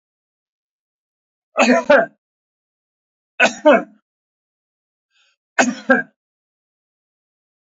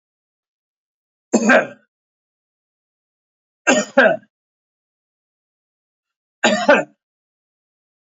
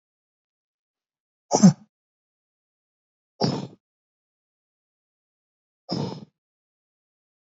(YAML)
three_cough_length: 7.7 s
three_cough_amplitude: 30056
three_cough_signal_mean_std_ratio: 0.28
cough_length: 8.1 s
cough_amplitude: 28829
cough_signal_mean_std_ratio: 0.27
exhalation_length: 7.5 s
exhalation_amplitude: 24044
exhalation_signal_mean_std_ratio: 0.18
survey_phase: alpha (2021-03-01 to 2021-08-12)
age: 45-64
gender: Male
wearing_mask: 'No'
symptom_cough_any: true
symptom_abdominal_pain: true
symptom_fatigue: true
symptom_fever_high_temperature: true
symptom_headache: true
symptom_change_to_sense_of_smell_or_taste: true
symptom_loss_of_taste: true
smoker_status: Ex-smoker
respiratory_condition_asthma: false
respiratory_condition_other: true
recruitment_source: Test and Trace
submission_delay: 3 days
covid_test_result: Positive
covid_test_method: LFT